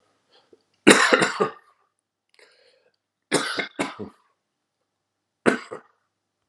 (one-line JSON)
{"three_cough_length": "6.5 s", "three_cough_amplitude": 32768, "three_cough_signal_mean_std_ratio": 0.28, "survey_phase": "alpha (2021-03-01 to 2021-08-12)", "age": "45-64", "gender": "Male", "wearing_mask": "No", "symptom_cough_any": true, "smoker_status": "Ex-smoker", "respiratory_condition_asthma": false, "respiratory_condition_other": false, "recruitment_source": "Test and Trace", "submission_delay": "1 day", "covid_test_result": "Positive", "covid_test_method": "RT-qPCR", "covid_ct_value": 34.3, "covid_ct_gene": "ORF1ab gene"}